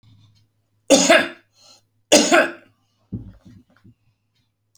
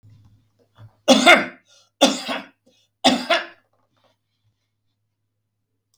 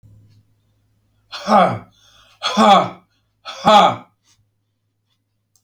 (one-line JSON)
{"cough_length": "4.8 s", "cough_amplitude": 32768, "cough_signal_mean_std_ratio": 0.31, "three_cough_length": "6.0 s", "three_cough_amplitude": 31942, "three_cough_signal_mean_std_ratio": 0.29, "exhalation_length": "5.6 s", "exhalation_amplitude": 30458, "exhalation_signal_mean_std_ratio": 0.34, "survey_phase": "alpha (2021-03-01 to 2021-08-12)", "age": "65+", "gender": "Male", "wearing_mask": "No", "symptom_none": true, "smoker_status": "Ex-smoker", "respiratory_condition_asthma": false, "respiratory_condition_other": false, "recruitment_source": "REACT", "submission_delay": "2 days", "covid_test_result": "Negative", "covid_test_method": "RT-qPCR"}